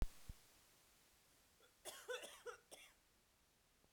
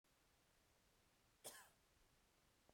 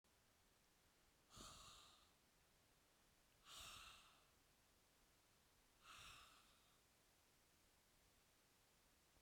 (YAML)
three_cough_length: 3.9 s
three_cough_amplitude: 1291
three_cough_signal_mean_std_ratio: 0.3
cough_length: 2.7 s
cough_amplitude: 265
cough_signal_mean_std_ratio: 0.47
exhalation_length: 9.2 s
exhalation_amplitude: 142
exhalation_signal_mean_std_ratio: 0.66
survey_phase: beta (2021-08-13 to 2022-03-07)
age: 45-64
gender: Female
wearing_mask: 'No'
symptom_cough_any: true
symptom_shortness_of_breath: true
symptom_fatigue: true
symptom_onset: 2 days
smoker_status: Never smoked
respiratory_condition_asthma: true
respiratory_condition_other: false
recruitment_source: Test and Trace
submission_delay: 2 days
covid_test_result: Positive
covid_test_method: RT-qPCR